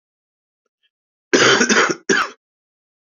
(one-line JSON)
{"cough_length": "3.2 s", "cough_amplitude": 27988, "cough_signal_mean_std_ratio": 0.4, "survey_phase": "beta (2021-08-13 to 2022-03-07)", "age": "18-44", "gender": "Male", "wearing_mask": "No", "symptom_none": true, "symptom_onset": "12 days", "smoker_status": "Never smoked", "respiratory_condition_asthma": false, "respiratory_condition_other": false, "recruitment_source": "REACT", "submission_delay": "2 days", "covid_test_result": "Negative", "covid_test_method": "RT-qPCR", "influenza_a_test_result": "Negative", "influenza_b_test_result": "Negative"}